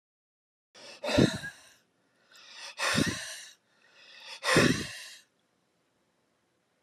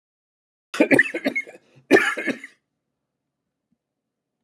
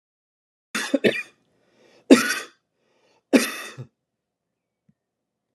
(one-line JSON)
{"exhalation_length": "6.8 s", "exhalation_amplitude": 11586, "exhalation_signal_mean_std_ratio": 0.35, "cough_length": "4.4 s", "cough_amplitude": 28723, "cough_signal_mean_std_ratio": 0.3, "three_cough_length": "5.5 s", "three_cough_amplitude": 32745, "three_cough_signal_mean_std_ratio": 0.25, "survey_phase": "alpha (2021-03-01 to 2021-08-12)", "age": "45-64", "gender": "Male", "wearing_mask": "No", "symptom_none": true, "symptom_onset": "12 days", "smoker_status": "Never smoked", "respiratory_condition_asthma": false, "respiratory_condition_other": false, "recruitment_source": "REACT", "submission_delay": "2 days", "covid_test_method": "RT-qPCR"}